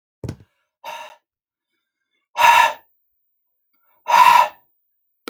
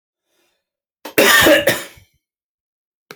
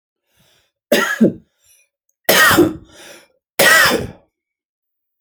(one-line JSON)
{"exhalation_length": "5.3 s", "exhalation_amplitude": 32157, "exhalation_signal_mean_std_ratio": 0.32, "cough_length": "3.2 s", "cough_amplitude": 32768, "cough_signal_mean_std_ratio": 0.36, "three_cough_length": "5.2 s", "three_cough_amplitude": 32768, "three_cough_signal_mean_std_ratio": 0.41, "survey_phase": "alpha (2021-03-01 to 2021-08-12)", "age": "45-64", "gender": "Male", "wearing_mask": "No", "symptom_none": true, "smoker_status": "Never smoked", "respiratory_condition_asthma": false, "respiratory_condition_other": false, "recruitment_source": "REACT", "submission_delay": "2 days", "covid_test_result": "Negative", "covid_test_method": "RT-qPCR"}